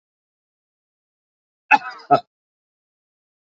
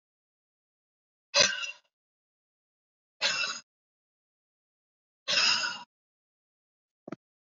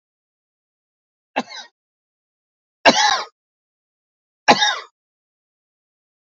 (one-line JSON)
{"cough_length": "3.5 s", "cough_amplitude": 27020, "cough_signal_mean_std_ratio": 0.17, "exhalation_length": "7.4 s", "exhalation_amplitude": 13952, "exhalation_signal_mean_std_ratio": 0.29, "three_cough_length": "6.2 s", "three_cough_amplitude": 30991, "three_cough_signal_mean_std_ratio": 0.24, "survey_phase": "beta (2021-08-13 to 2022-03-07)", "age": "65+", "gender": "Male", "wearing_mask": "No", "symptom_cough_any": true, "symptom_onset": "3 days", "smoker_status": "Ex-smoker", "respiratory_condition_asthma": false, "respiratory_condition_other": false, "recruitment_source": "Test and Trace", "submission_delay": "2 days", "covid_test_result": "Positive", "covid_test_method": "RT-qPCR", "covid_ct_value": 20.3, "covid_ct_gene": "S gene", "covid_ct_mean": 21.1, "covid_viral_load": "120000 copies/ml", "covid_viral_load_category": "Low viral load (10K-1M copies/ml)"}